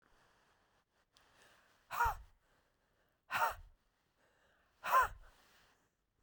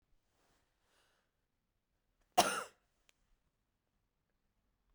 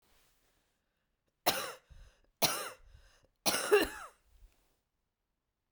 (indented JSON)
{
  "exhalation_length": "6.2 s",
  "exhalation_amplitude": 3785,
  "exhalation_signal_mean_std_ratio": 0.28,
  "cough_length": "4.9 s",
  "cough_amplitude": 6958,
  "cough_signal_mean_std_ratio": 0.15,
  "three_cough_length": "5.7 s",
  "three_cough_amplitude": 6598,
  "three_cough_signal_mean_std_ratio": 0.29,
  "survey_phase": "beta (2021-08-13 to 2022-03-07)",
  "age": "45-64",
  "gender": "Female",
  "wearing_mask": "No",
  "symptom_cough_any": true,
  "symptom_runny_or_blocked_nose": true,
  "symptom_shortness_of_breath": true,
  "symptom_fatigue": true,
  "symptom_other": true,
  "symptom_onset": "3 days",
  "smoker_status": "Never smoked",
  "respiratory_condition_asthma": true,
  "respiratory_condition_other": false,
  "recruitment_source": "Test and Trace",
  "submission_delay": "2 days",
  "covid_test_result": "Positive",
  "covid_test_method": "RT-qPCR",
  "covid_ct_value": 15.8,
  "covid_ct_gene": "ORF1ab gene",
  "covid_ct_mean": 17.1,
  "covid_viral_load": "2600000 copies/ml",
  "covid_viral_load_category": "High viral load (>1M copies/ml)"
}